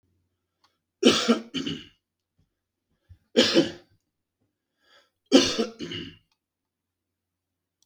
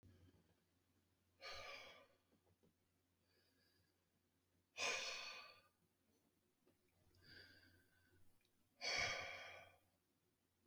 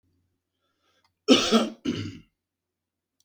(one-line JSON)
{"three_cough_length": "7.9 s", "three_cough_amplitude": 21566, "three_cough_signal_mean_std_ratio": 0.29, "exhalation_length": "10.7 s", "exhalation_amplitude": 944, "exhalation_signal_mean_std_ratio": 0.36, "cough_length": "3.2 s", "cough_amplitude": 20162, "cough_signal_mean_std_ratio": 0.31, "survey_phase": "beta (2021-08-13 to 2022-03-07)", "age": "45-64", "gender": "Male", "wearing_mask": "No", "symptom_none": true, "smoker_status": "Ex-smoker", "respiratory_condition_asthma": false, "respiratory_condition_other": false, "recruitment_source": "REACT", "submission_delay": "1 day", "covid_test_result": "Negative", "covid_test_method": "RT-qPCR", "influenza_a_test_result": "Negative", "influenza_b_test_result": "Negative"}